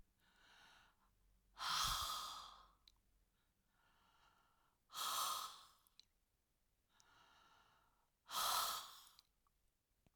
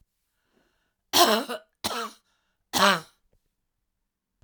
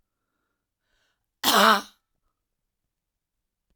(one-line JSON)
{"exhalation_length": "10.2 s", "exhalation_amplitude": 1214, "exhalation_signal_mean_std_ratio": 0.39, "three_cough_length": "4.4 s", "three_cough_amplitude": 26912, "three_cough_signal_mean_std_ratio": 0.3, "cough_length": "3.8 s", "cough_amplitude": 21960, "cough_signal_mean_std_ratio": 0.23, "survey_phase": "alpha (2021-03-01 to 2021-08-12)", "age": "65+", "gender": "Female", "wearing_mask": "No", "symptom_none": true, "smoker_status": "Never smoked", "respiratory_condition_asthma": false, "respiratory_condition_other": false, "recruitment_source": "REACT", "submission_delay": "2 days", "covid_test_result": "Negative", "covid_test_method": "RT-qPCR"}